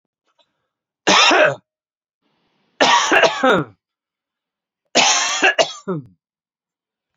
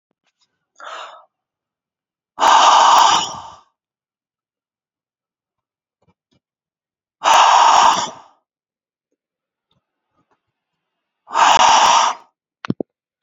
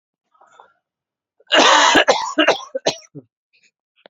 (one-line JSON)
{"three_cough_length": "7.2 s", "three_cough_amplitude": 32767, "three_cough_signal_mean_std_ratio": 0.42, "exhalation_length": "13.2 s", "exhalation_amplitude": 32767, "exhalation_signal_mean_std_ratio": 0.37, "cough_length": "4.1 s", "cough_amplitude": 32767, "cough_signal_mean_std_ratio": 0.4, "survey_phase": "beta (2021-08-13 to 2022-03-07)", "age": "18-44", "gender": "Male", "wearing_mask": "No", "symptom_cough_any": true, "symptom_runny_or_blocked_nose": true, "symptom_fatigue": true, "symptom_fever_high_temperature": true, "symptom_headache": true, "symptom_change_to_sense_of_smell_or_taste": true, "smoker_status": "Ex-smoker", "respiratory_condition_asthma": false, "respiratory_condition_other": false, "recruitment_source": "Test and Trace", "submission_delay": "1 day", "covid_test_result": "Positive", "covid_test_method": "RT-qPCR"}